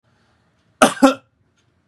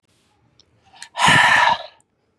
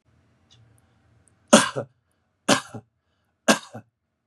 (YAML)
cough_length: 1.9 s
cough_amplitude: 32768
cough_signal_mean_std_ratio: 0.26
exhalation_length: 2.4 s
exhalation_amplitude: 26727
exhalation_signal_mean_std_ratio: 0.44
three_cough_length: 4.3 s
three_cough_amplitude: 32768
three_cough_signal_mean_std_ratio: 0.23
survey_phase: beta (2021-08-13 to 2022-03-07)
age: 45-64
gender: Male
wearing_mask: 'Yes'
symptom_none: true
smoker_status: Never smoked
respiratory_condition_asthma: false
respiratory_condition_other: false
recruitment_source: REACT
submission_delay: 3 days
covid_test_result: Negative
covid_test_method: RT-qPCR
influenza_a_test_result: Negative
influenza_b_test_result: Negative